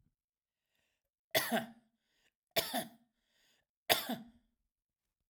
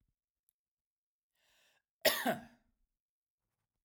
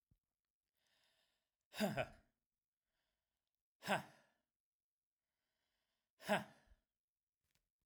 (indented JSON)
{
  "three_cough_length": "5.3 s",
  "three_cough_amplitude": 11353,
  "three_cough_signal_mean_std_ratio": 0.28,
  "cough_length": "3.8 s",
  "cough_amplitude": 6324,
  "cough_signal_mean_std_ratio": 0.21,
  "exhalation_length": "7.9 s",
  "exhalation_amplitude": 2385,
  "exhalation_signal_mean_std_ratio": 0.22,
  "survey_phase": "alpha (2021-03-01 to 2021-08-12)",
  "age": "45-64",
  "gender": "Male",
  "wearing_mask": "No",
  "symptom_fatigue": true,
  "smoker_status": "Ex-smoker",
  "respiratory_condition_asthma": false,
  "respiratory_condition_other": false,
  "recruitment_source": "REACT",
  "submission_delay": "1 day",
  "covid_test_result": "Negative",
  "covid_test_method": "RT-qPCR"
}